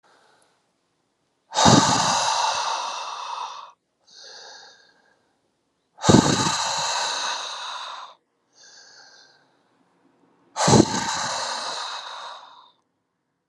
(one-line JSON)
{"exhalation_length": "13.5 s", "exhalation_amplitude": 31490, "exhalation_signal_mean_std_ratio": 0.44, "survey_phase": "alpha (2021-03-01 to 2021-08-12)", "age": "45-64", "gender": "Male", "wearing_mask": "No", "symptom_cough_any": true, "symptom_shortness_of_breath": true, "symptom_fatigue": true, "symptom_headache": true, "symptom_onset": "5 days", "smoker_status": "Ex-smoker", "respiratory_condition_asthma": false, "respiratory_condition_other": false, "recruitment_source": "Test and Trace", "submission_delay": "2 days", "covid_test_result": "Positive", "covid_test_method": "RT-qPCR", "covid_ct_value": 24.6, "covid_ct_gene": "ORF1ab gene"}